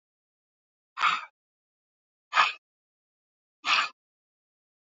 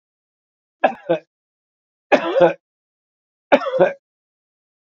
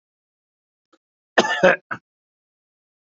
{"exhalation_length": "4.9 s", "exhalation_amplitude": 14748, "exhalation_signal_mean_std_ratio": 0.26, "three_cough_length": "4.9 s", "three_cough_amplitude": 31369, "three_cough_signal_mean_std_ratio": 0.31, "cough_length": "3.2 s", "cough_amplitude": 27051, "cough_signal_mean_std_ratio": 0.24, "survey_phase": "beta (2021-08-13 to 2022-03-07)", "age": "45-64", "gender": "Male", "wearing_mask": "No", "symptom_none": true, "smoker_status": "Ex-smoker", "respiratory_condition_asthma": false, "respiratory_condition_other": false, "recruitment_source": "REACT", "submission_delay": "2 days", "covid_test_result": "Negative", "covid_test_method": "RT-qPCR", "influenza_a_test_result": "Negative", "influenza_b_test_result": "Negative"}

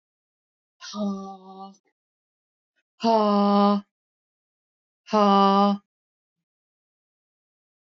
{"exhalation_length": "7.9 s", "exhalation_amplitude": 17873, "exhalation_signal_mean_std_ratio": 0.35, "survey_phase": "beta (2021-08-13 to 2022-03-07)", "age": "45-64", "gender": "Female", "wearing_mask": "No", "symptom_none": true, "smoker_status": "Never smoked", "respiratory_condition_asthma": false, "respiratory_condition_other": false, "recruitment_source": "REACT", "submission_delay": "0 days", "covid_test_result": "Negative", "covid_test_method": "RT-qPCR", "influenza_a_test_result": "Negative", "influenza_b_test_result": "Negative"}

